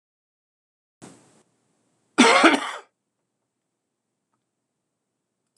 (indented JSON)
{
  "cough_length": "5.6 s",
  "cough_amplitude": 26027,
  "cough_signal_mean_std_ratio": 0.22,
  "survey_phase": "beta (2021-08-13 to 2022-03-07)",
  "age": "45-64",
  "gender": "Male",
  "wearing_mask": "No",
  "symptom_new_continuous_cough": true,
  "symptom_runny_or_blocked_nose": true,
  "symptom_onset": "6 days",
  "smoker_status": "Never smoked",
  "respiratory_condition_asthma": true,
  "respiratory_condition_other": false,
  "recruitment_source": "REACT",
  "submission_delay": "1 day",
  "covid_test_result": "Positive",
  "covid_test_method": "RT-qPCR",
  "covid_ct_value": 13.0,
  "covid_ct_gene": "N gene",
  "influenza_a_test_result": "Negative",
  "influenza_b_test_result": "Negative"
}